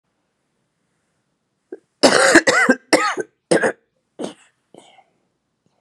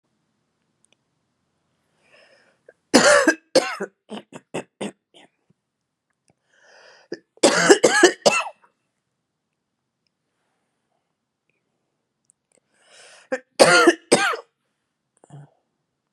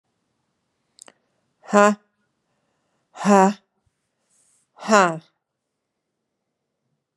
{"cough_length": "5.8 s", "cough_amplitude": 32768, "cough_signal_mean_std_ratio": 0.34, "three_cough_length": "16.1 s", "three_cough_amplitude": 32768, "three_cough_signal_mean_std_ratio": 0.27, "exhalation_length": "7.2 s", "exhalation_amplitude": 31814, "exhalation_signal_mean_std_ratio": 0.24, "survey_phase": "beta (2021-08-13 to 2022-03-07)", "age": "45-64", "gender": "Female", "wearing_mask": "No", "symptom_cough_any": true, "symptom_runny_or_blocked_nose": true, "symptom_headache": true, "symptom_change_to_sense_of_smell_or_taste": true, "symptom_onset": "8 days", "smoker_status": "Ex-smoker", "respiratory_condition_asthma": false, "respiratory_condition_other": false, "recruitment_source": "Test and Trace", "submission_delay": "1 day", "covid_test_result": "Positive", "covid_test_method": "RT-qPCR", "covid_ct_value": 18.0, "covid_ct_gene": "N gene", "covid_ct_mean": 18.1, "covid_viral_load": "1200000 copies/ml", "covid_viral_load_category": "High viral load (>1M copies/ml)"}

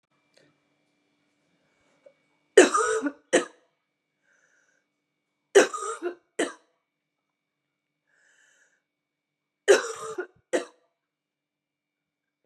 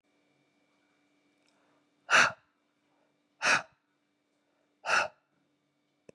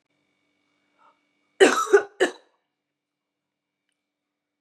{"three_cough_length": "12.5 s", "three_cough_amplitude": 29089, "three_cough_signal_mean_std_ratio": 0.22, "exhalation_length": "6.1 s", "exhalation_amplitude": 10064, "exhalation_signal_mean_std_ratio": 0.24, "cough_length": "4.6 s", "cough_amplitude": 26343, "cough_signal_mean_std_ratio": 0.23, "survey_phase": "beta (2021-08-13 to 2022-03-07)", "age": "18-44", "gender": "Female", "wearing_mask": "No", "symptom_cough_any": true, "symptom_runny_or_blocked_nose": true, "symptom_fatigue": true, "symptom_fever_high_temperature": true, "symptom_headache": true, "smoker_status": "Ex-smoker", "respiratory_condition_asthma": false, "respiratory_condition_other": false, "recruitment_source": "Test and Trace", "submission_delay": "1 day", "covid_test_result": "Positive", "covid_test_method": "ePCR"}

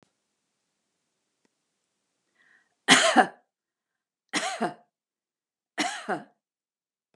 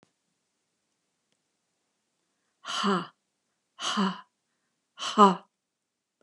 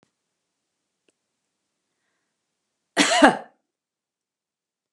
{"three_cough_length": "7.2 s", "three_cough_amplitude": 28964, "three_cough_signal_mean_std_ratio": 0.25, "exhalation_length": "6.2 s", "exhalation_amplitude": 25237, "exhalation_signal_mean_std_ratio": 0.25, "cough_length": "4.9 s", "cough_amplitude": 32767, "cough_signal_mean_std_ratio": 0.2, "survey_phase": "beta (2021-08-13 to 2022-03-07)", "age": "65+", "gender": "Female", "wearing_mask": "No", "symptom_none": true, "smoker_status": "Never smoked", "respiratory_condition_asthma": false, "respiratory_condition_other": false, "recruitment_source": "REACT", "submission_delay": "2 days", "covid_test_result": "Negative", "covid_test_method": "RT-qPCR", "influenza_a_test_result": "Negative", "influenza_b_test_result": "Negative"}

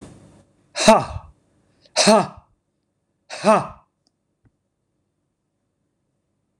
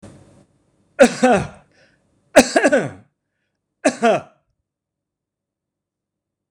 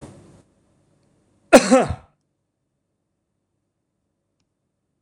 {"exhalation_length": "6.6 s", "exhalation_amplitude": 26028, "exhalation_signal_mean_std_ratio": 0.26, "three_cough_length": "6.5 s", "three_cough_amplitude": 26028, "three_cough_signal_mean_std_ratio": 0.3, "cough_length": "5.0 s", "cough_amplitude": 26028, "cough_signal_mean_std_ratio": 0.19, "survey_phase": "beta (2021-08-13 to 2022-03-07)", "age": "65+", "gender": "Male", "wearing_mask": "No", "symptom_runny_or_blocked_nose": true, "symptom_onset": "12 days", "smoker_status": "Ex-smoker", "respiratory_condition_asthma": false, "respiratory_condition_other": false, "recruitment_source": "REACT", "submission_delay": "1 day", "covid_test_result": "Negative", "covid_test_method": "RT-qPCR", "influenza_a_test_result": "Negative", "influenza_b_test_result": "Negative"}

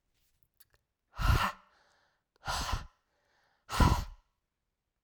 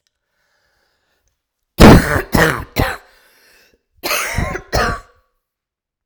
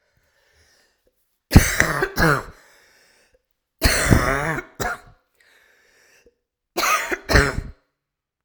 {"exhalation_length": "5.0 s", "exhalation_amplitude": 8263, "exhalation_signal_mean_std_ratio": 0.33, "cough_length": "6.1 s", "cough_amplitude": 32768, "cough_signal_mean_std_ratio": 0.33, "three_cough_length": "8.4 s", "three_cough_amplitude": 32768, "three_cough_signal_mean_std_ratio": 0.37, "survey_phase": "alpha (2021-03-01 to 2021-08-12)", "age": "18-44", "gender": "Female", "wearing_mask": "No", "symptom_cough_any": true, "symptom_fatigue": true, "symptom_headache": true, "symptom_onset": "4 days", "smoker_status": "Ex-smoker", "respiratory_condition_asthma": false, "respiratory_condition_other": false, "recruitment_source": "Test and Trace", "submission_delay": "2 days", "covid_test_result": "Positive", "covid_test_method": "RT-qPCR", "covid_ct_value": 18.6, "covid_ct_gene": "ORF1ab gene", "covid_ct_mean": 19.4, "covid_viral_load": "430000 copies/ml", "covid_viral_load_category": "Low viral load (10K-1M copies/ml)"}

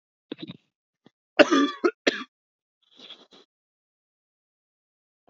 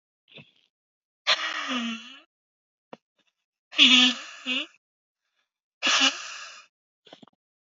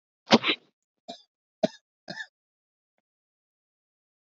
{"cough_length": "5.3 s", "cough_amplitude": 32768, "cough_signal_mean_std_ratio": 0.22, "exhalation_length": "7.7 s", "exhalation_amplitude": 20698, "exhalation_signal_mean_std_ratio": 0.33, "three_cough_length": "4.3 s", "three_cough_amplitude": 26241, "three_cough_signal_mean_std_ratio": 0.17, "survey_phase": "beta (2021-08-13 to 2022-03-07)", "age": "18-44", "gender": "Male", "wearing_mask": "No", "symptom_runny_or_blocked_nose": true, "symptom_fatigue": true, "symptom_headache": true, "smoker_status": "Never smoked", "respiratory_condition_asthma": false, "respiratory_condition_other": true, "recruitment_source": "REACT", "submission_delay": "3 days", "covid_test_result": "Negative", "covid_test_method": "RT-qPCR", "influenza_a_test_result": "Negative", "influenza_b_test_result": "Negative"}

